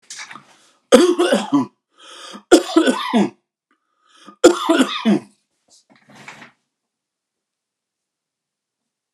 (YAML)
three_cough_length: 9.1 s
three_cough_amplitude: 32768
three_cough_signal_mean_std_ratio: 0.35
survey_phase: beta (2021-08-13 to 2022-03-07)
age: 65+
gender: Male
wearing_mask: 'No'
symptom_none: true
smoker_status: Ex-smoker
respiratory_condition_asthma: false
respiratory_condition_other: false
recruitment_source: REACT
submission_delay: 2 days
covid_test_result: Negative
covid_test_method: RT-qPCR